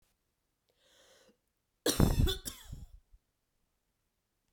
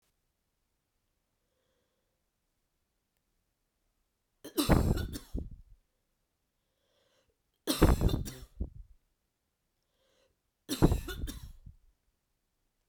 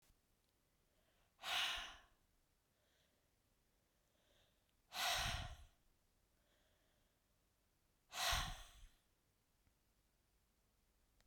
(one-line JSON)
{"cough_length": "4.5 s", "cough_amplitude": 10941, "cough_signal_mean_std_ratio": 0.27, "three_cough_length": "12.9 s", "three_cough_amplitude": 12929, "three_cough_signal_mean_std_ratio": 0.26, "exhalation_length": "11.3 s", "exhalation_amplitude": 1211, "exhalation_signal_mean_std_ratio": 0.32, "survey_phase": "beta (2021-08-13 to 2022-03-07)", "age": "45-64", "gender": "Female", "wearing_mask": "No", "symptom_runny_or_blocked_nose": true, "symptom_fatigue": true, "symptom_headache": true, "symptom_other": true, "smoker_status": "Never smoked", "respiratory_condition_asthma": false, "respiratory_condition_other": false, "recruitment_source": "Test and Trace", "submission_delay": "2 days", "covid_test_result": "Positive", "covid_test_method": "RT-qPCR", "covid_ct_value": 17.6, "covid_ct_gene": "ORF1ab gene", "covid_ct_mean": 17.9, "covid_viral_load": "1400000 copies/ml", "covid_viral_load_category": "High viral load (>1M copies/ml)"}